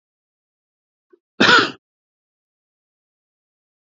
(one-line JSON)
{"cough_length": "3.8 s", "cough_amplitude": 29574, "cough_signal_mean_std_ratio": 0.21, "survey_phase": "beta (2021-08-13 to 2022-03-07)", "age": "18-44", "gender": "Male", "wearing_mask": "No", "symptom_none": true, "symptom_onset": "5 days", "smoker_status": "Never smoked", "respiratory_condition_asthma": false, "respiratory_condition_other": true, "recruitment_source": "REACT", "submission_delay": "1 day", "covid_test_result": "Negative", "covid_test_method": "RT-qPCR", "influenza_a_test_result": "Negative", "influenza_b_test_result": "Negative"}